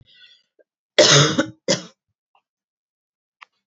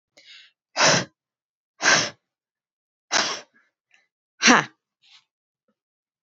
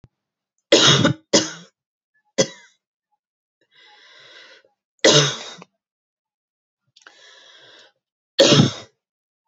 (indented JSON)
{
  "cough_length": "3.7 s",
  "cough_amplitude": 31552,
  "cough_signal_mean_std_ratio": 0.3,
  "exhalation_length": "6.2 s",
  "exhalation_amplitude": 27780,
  "exhalation_signal_mean_std_ratio": 0.29,
  "three_cough_length": "9.5 s",
  "three_cough_amplitude": 32768,
  "three_cough_signal_mean_std_ratio": 0.3,
  "survey_phase": "beta (2021-08-13 to 2022-03-07)",
  "age": "18-44",
  "gender": "Female",
  "wearing_mask": "No",
  "symptom_none": true,
  "smoker_status": "Never smoked",
  "respiratory_condition_asthma": false,
  "respiratory_condition_other": false,
  "recruitment_source": "REACT",
  "submission_delay": "2 days",
  "covid_test_result": "Negative",
  "covid_test_method": "RT-qPCR",
  "influenza_a_test_result": "Negative",
  "influenza_b_test_result": "Negative"
}